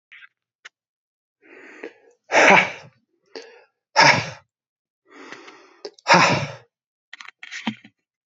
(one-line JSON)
{"exhalation_length": "8.3 s", "exhalation_amplitude": 28947, "exhalation_signal_mean_std_ratio": 0.3, "survey_phase": "beta (2021-08-13 to 2022-03-07)", "age": "18-44", "gender": "Male", "wearing_mask": "No", "symptom_cough_any": true, "symptom_runny_or_blocked_nose": true, "symptom_fatigue": true, "symptom_onset": "2 days", "smoker_status": "Never smoked", "respiratory_condition_asthma": false, "respiratory_condition_other": false, "recruitment_source": "Test and Trace", "submission_delay": "2 days", "covid_test_result": "Positive", "covid_test_method": "RT-qPCR", "covid_ct_value": 16.2, "covid_ct_gene": "S gene", "covid_ct_mean": 16.8, "covid_viral_load": "3100000 copies/ml", "covid_viral_load_category": "High viral load (>1M copies/ml)"}